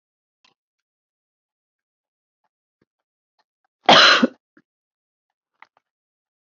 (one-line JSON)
{"cough_length": "6.5 s", "cough_amplitude": 30166, "cough_signal_mean_std_ratio": 0.19, "survey_phase": "beta (2021-08-13 to 2022-03-07)", "age": "45-64", "gender": "Female", "wearing_mask": "No", "symptom_new_continuous_cough": true, "symptom_runny_or_blocked_nose": true, "smoker_status": "Never smoked", "respiratory_condition_asthma": false, "respiratory_condition_other": false, "recruitment_source": "Test and Trace", "submission_delay": "1 day", "covid_test_result": "Positive", "covid_test_method": "ePCR"}